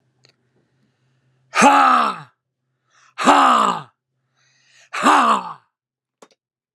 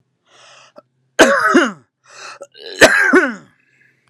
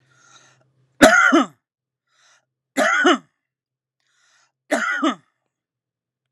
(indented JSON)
{
  "exhalation_length": "6.7 s",
  "exhalation_amplitude": 32767,
  "exhalation_signal_mean_std_ratio": 0.39,
  "cough_length": "4.1 s",
  "cough_amplitude": 32768,
  "cough_signal_mean_std_ratio": 0.41,
  "three_cough_length": "6.3 s",
  "three_cough_amplitude": 32768,
  "three_cough_signal_mean_std_ratio": 0.34,
  "survey_phase": "alpha (2021-03-01 to 2021-08-12)",
  "age": "18-44",
  "gender": "Male",
  "wearing_mask": "No",
  "symptom_none": true,
  "smoker_status": "Ex-smoker",
  "respiratory_condition_asthma": false,
  "respiratory_condition_other": false,
  "recruitment_source": "REACT",
  "submission_delay": "1 day",
  "covid_test_result": "Negative",
  "covid_test_method": "RT-qPCR"
}